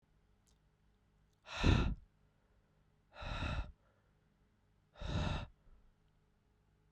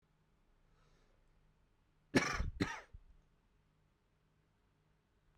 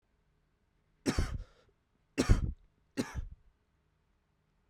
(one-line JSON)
{"exhalation_length": "6.9 s", "exhalation_amplitude": 4048, "exhalation_signal_mean_std_ratio": 0.33, "cough_length": "5.4 s", "cough_amplitude": 4724, "cough_signal_mean_std_ratio": 0.25, "three_cough_length": "4.7 s", "three_cough_amplitude": 8013, "three_cough_signal_mean_std_ratio": 0.3, "survey_phase": "beta (2021-08-13 to 2022-03-07)", "age": "18-44", "gender": "Male", "wearing_mask": "No", "symptom_cough_any": true, "symptom_new_continuous_cough": true, "symptom_runny_or_blocked_nose": true, "symptom_shortness_of_breath": true, "symptom_change_to_sense_of_smell_or_taste": true, "symptom_loss_of_taste": true, "symptom_onset": "3 days", "smoker_status": "Never smoked", "respiratory_condition_asthma": false, "respiratory_condition_other": false, "recruitment_source": "Test and Trace", "submission_delay": "2 days", "covid_test_result": "Positive", "covid_test_method": "RT-qPCR", "covid_ct_value": 18.6, "covid_ct_gene": "ORF1ab gene"}